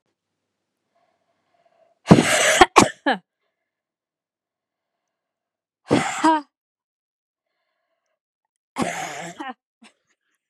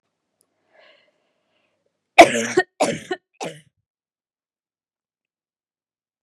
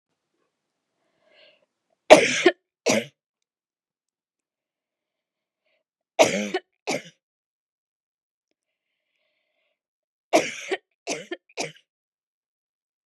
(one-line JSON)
{"exhalation_length": "10.5 s", "exhalation_amplitude": 32768, "exhalation_signal_mean_std_ratio": 0.26, "cough_length": "6.2 s", "cough_amplitude": 32768, "cough_signal_mean_std_ratio": 0.18, "three_cough_length": "13.1 s", "three_cough_amplitude": 32768, "three_cough_signal_mean_std_ratio": 0.2, "survey_phase": "beta (2021-08-13 to 2022-03-07)", "age": "18-44", "gender": "Female", "wearing_mask": "No", "symptom_cough_any": true, "symptom_runny_or_blocked_nose": true, "symptom_shortness_of_breath": true, "symptom_sore_throat": true, "symptom_diarrhoea": true, "symptom_fatigue": true, "symptom_headache": true, "symptom_change_to_sense_of_smell_or_taste": true, "symptom_other": true, "symptom_onset": "7 days", "smoker_status": "Never smoked", "respiratory_condition_asthma": false, "respiratory_condition_other": false, "recruitment_source": "Test and Trace", "submission_delay": "2 days", "covid_test_result": "Positive", "covid_test_method": "ePCR"}